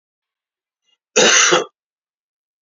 cough_length: 2.6 s
cough_amplitude: 31900
cough_signal_mean_std_ratio: 0.35
survey_phase: beta (2021-08-13 to 2022-03-07)
age: 65+
gender: Male
wearing_mask: 'No'
symptom_cough_any: true
symptom_runny_or_blocked_nose: true
smoker_status: Ex-smoker
respiratory_condition_asthma: false
respiratory_condition_other: false
recruitment_source: Test and Trace
submission_delay: 2 days
covid_test_result: Positive
covid_test_method: ePCR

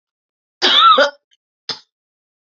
cough_length: 2.6 s
cough_amplitude: 32767
cough_signal_mean_std_ratio: 0.37
survey_phase: beta (2021-08-13 to 2022-03-07)
age: 18-44
gender: Female
wearing_mask: 'No'
symptom_cough_any: true
symptom_sore_throat: true
symptom_abdominal_pain: true
symptom_fatigue: true
symptom_change_to_sense_of_smell_or_taste: true
symptom_loss_of_taste: true
symptom_onset: 2 days
smoker_status: Never smoked
respiratory_condition_asthma: false
respiratory_condition_other: false
recruitment_source: Test and Trace
submission_delay: 2 days
covid_test_result: Positive
covid_test_method: RT-qPCR
covid_ct_value: 20.1
covid_ct_gene: ORF1ab gene
covid_ct_mean: 20.6
covid_viral_load: 170000 copies/ml
covid_viral_load_category: Low viral load (10K-1M copies/ml)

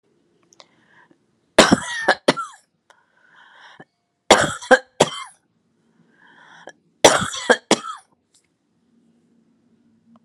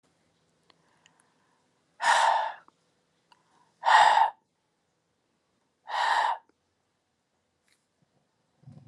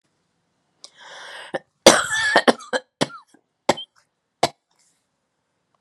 three_cough_length: 10.2 s
three_cough_amplitude: 32768
three_cough_signal_mean_std_ratio: 0.25
exhalation_length: 8.9 s
exhalation_amplitude: 16516
exhalation_signal_mean_std_ratio: 0.31
cough_length: 5.8 s
cough_amplitude: 32768
cough_signal_mean_std_ratio: 0.26
survey_phase: alpha (2021-03-01 to 2021-08-12)
age: 45-64
gender: Female
wearing_mask: 'No'
symptom_cough_any: true
symptom_abdominal_pain: true
symptom_fatigue: true
symptom_change_to_sense_of_smell_or_taste: true
smoker_status: Never smoked
respiratory_condition_asthma: false
respiratory_condition_other: false
recruitment_source: Test and Trace
submission_delay: 2 days
covid_test_result: Positive
covid_test_method: RT-qPCR
covid_ct_value: 20.8
covid_ct_gene: ORF1ab gene
covid_ct_mean: 21.3
covid_viral_load: 100000 copies/ml
covid_viral_load_category: Low viral load (10K-1M copies/ml)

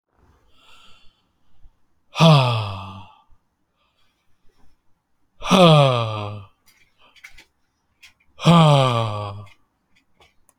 exhalation_length: 10.6 s
exhalation_amplitude: 32767
exhalation_signal_mean_std_ratio: 0.36
survey_phase: alpha (2021-03-01 to 2021-08-12)
age: 18-44
gender: Male
wearing_mask: 'No'
symptom_none: true
smoker_status: Current smoker (e-cigarettes or vapes only)
respiratory_condition_asthma: false
respiratory_condition_other: false
recruitment_source: REACT
submission_delay: 0 days
covid_test_result: Negative
covid_test_method: RT-qPCR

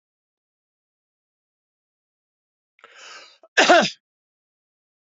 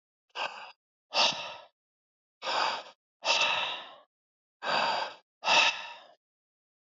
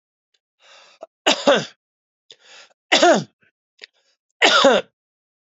cough_length: 5.1 s
cough_amplitude: 27598
cough_signal_mean_std_ratio: 0.2
exhalation_length: 6.9 s
exhalation_amplitude: 8625
exhalation_signal_mean_std_ratio: 0.46
three_cough_length: 5.5 s
three_cough_amplitude: 31129
three_cough_signal_mean_std_ratio: 0.34
survey_phase: beta (2021-08-13 to 2022-03-07)
age: 65+
gender: Male
wearing_mask: 'No'
symptom_none: true
symptom_onset: 2 days
smoker_status: Never smoked
respiratory_condition_asthma: false
respiratory_condition_other: false
recruitment_source: Test and Trace
submission_delay: 1 day
covid_test_result: Positive
covid_test_method: RT-qPCR
covid_ct_value: 19.6
covid_ct_gene: ORF1ab gene
covid_ct_mean: 19.9
covid_viral_load: 310000 copies/ml
covid_viral_load_category: Low viral load (10K-1M copies/ml)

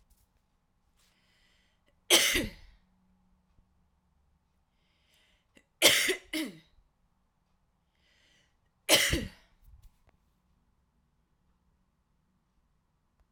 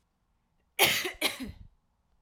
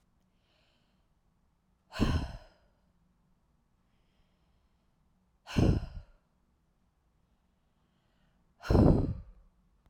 three_cough_length: 13.3 s
three_cough_amplitude: 15747
three_cough_signal_mean_std_ratio: 0.23
cough_length: 2.2 s
cough_amplitude: 14398
cough_signal_mean_std_ratio: 0.37
exhalation_length: 9.9 s
exhalation_amplitude: 9715
exhalation_signal_mean_std_ratio: 0.26
survey_phase: alpha (2021-03-01 to 2021-08-12)
age: 18-44
gender: Female
wearing_mask: 'No'
symptom_none: true
smoker_status: Ex-smoker
respiratory_condition_asthma: false
respiratory_condition_other: false
recruitment_source: REACT
submission_delay: 2 days
covid_test_result: Negative
covid_test_method: RT-qPCR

